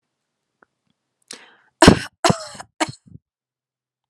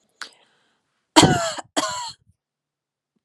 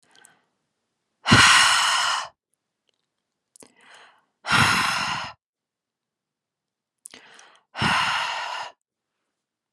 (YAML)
three_cough_length: 4.1 s
three_cough_amplitude: 32768
three_cough_signal_mean_std_ratio: 0.21
cough_length: 3.2 s
cough_amplitude: 32768
cough_signal_mean_std_ratio: 0.29
exhalation_length: 9.7 s
exhalation_amplitude: 25850
exhalation_signal_mean_std_ratio: 0.39
survey_phase: alpha (2021-03-01 to 2021-08-12)
age: 18-44
gender: Female
wearing_mask: 'No'
symptom_none: true
symptom_onset: 13 days
smoker_status: Never smoked
respiratory_condition_asthma: false
respiratory_condition_other: false
recruitment_source: REACT
submission_delay: 1 day
covid_test_result: Negative
covid_test_method: RT-qPCR